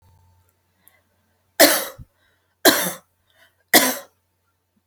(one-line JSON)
{"three_cough_length": "4.9 s", "three_cough_amplitude": 32768, "three_cough_signal_mean_std_ratio": 0.28, "survey_phase": "alpha (2021-03-01 to 2021-08-12)", "age": "45-64", "gender": "Female", "wearing_mask": "No", "symptom_none": true, "smoker_status": "Never smoked", "respiratory_condition_asthma": true, "respiratory_condition_other": false, "recruitment_source": "REACT", "submission_delay": "3 days", "covid_test_result": "Negative", "covid_test_method": "RT-qPCR"}